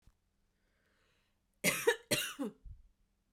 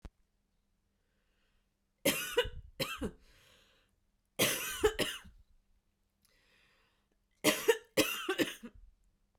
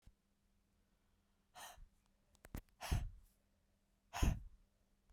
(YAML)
cough_length: 3.3 s
cough_amplitude: 5658
cough_signal_mean_std_ratio: 0.32
three_cough_length: 9.4 s
three_cough_amplitude: 7271
three_cough_signal_mean_std_ratio: 0.35
exhalation_length: 5.1 s
exhalation_amplitude: 2835
exhalation_signal_mean_std_ratio: 0.27
survey_phase: beta (2021-08-13 to 2022-03-07)
age: 45-64
gender: Female
wearing_mask: 'No'
symptom_cough_any: true
symptom_runny_or_blocked_nose: true
symptom_onset: 4 days
smoker_status: Never smoked
respiratory_condition_asthma: false
respiratory_condition_other: false
recruitment_source: Test and Trace
submission_delay: 1 day
covid_test_result: Positive
covid_test_method: ePCR